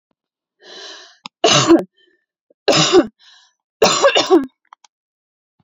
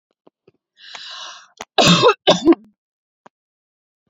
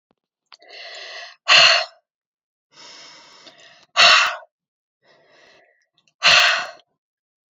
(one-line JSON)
{"three_cough_length": "5.6 s", "three_cough_amplitude": 32547, "three_cough_signal_mean_std_ratio": 0.4, "cough_length": "4.1 s", "cough_amplitude": 32219, "cough_signal_mean_std_ratio": 0.32, "exhalation_length": "7.5 s", "exhalation_amplitude": 32768, "exhalation_signal_mean_std_ratio": 0.32, "survey_phase": "alpha (2021-03-01 to 2021-08-12)", "age": "18-44", "gender": "Female", "wearing_mask": "No", "symptom_none": true, "symptom_onset": "9 days", "smoker_status": "Ex-smoker", "respiratory_condition_asthma": false, "respiratory_condition_other": false, "recruitment_source": "REACT", "submission_delay": "2 days", "covid_test_result": "Negative", "covid_test_method": "RT-qPCR"}